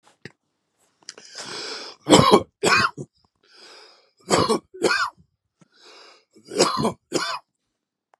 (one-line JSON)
{"three_cough_length": "8.2 s", "three_cough_amplitude": 32766, "three_cough_signal_mean_std_ratio": 0.37, "survey_phase": "beta (2021-08-13 to 2022-03-07)", "age": "65+", "gender": "Male", "wearing_mask": "No", "symptom_none": true, "smoker_status": "Ex-smoker", "respiratory_condition_asthma": false, "respiratory_condition_other": false, "recruitment_source": "REACT", "submission_delay": "2 days", "covid_test_result": "Negative", "covid_test_method": "RT-qPCR", "influenza_a_test_result": "Negative", "influenza_b_test_result": "Negative"}